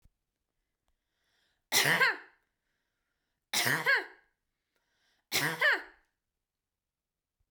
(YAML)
three_cough_length: 7.5 s
three_cough_amplitude: 7389
three_cough_signal_mean_std_ratio: 0.34
survey_phase: beta (2021-08-13 to 2022-03-07)
age: 45-64
gender: Female
wearing_mask: 'No'
symptom_none: true
smoker_status: Ex-smoker
respiratory_condition_asthma: false
respiratory_condition_other: false
recruitment_source: REACT
submission_delay: 3 days
covid_test_result: Negative
covid_test_method: RT-qPCR